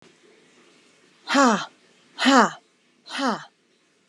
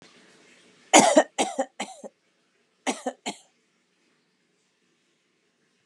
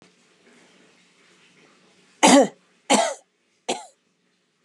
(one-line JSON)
{"exhalation_length": "4.1 s", "exhalation_amplitude": 29544, "exhalation_signal_mean_std_ratio": 0.34, "cough_length": "5.9 s", "cough_amplitude": 31225, "cough_signal_mean_std_ratio": 0.24, "three_cough_length": "4.6 s", "three_cough_amplitude": 28778, "three_cough_signal_mean_std_ratio": 0.26, "survey_phase": "beta (2021-08-13 to 2022-03-07)", "age": "45-64", "gender": "Female", "wearing_mask": "No", "symptom_none": true, "smoker_status": "Never smoked", "respiratory_condition_asthma": false, "respiratory_condition_other": false, "recruitment_source": "REACT", "submission_delay": "3 days", "covid_test_result": "Negative", "covid_test_method": "RT-qPCR", "influenza_a_test_result": "Negative", "influenza_b_test_result": "Negative"}